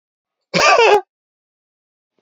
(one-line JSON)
{"cough_length": "2.2 s", "cough_amplitude": 29939, "cough_signal_mean_std_ratio": 0.38, "survey_phase": "alpha (2021-03-01 to 2021-08-12)", "age": "45-64", "gender": "Male", "wearing_mask": "No", "symptom_none": true, "smoker_status": "Never smoked", "respiratory_condition_asthma": false, "respiratory_condition_other": false, "recruitment_source": "REACT", "submission_delay": "31 days", "covid_test_result": "Negative", "covid_test_method": "RT-qPCR"}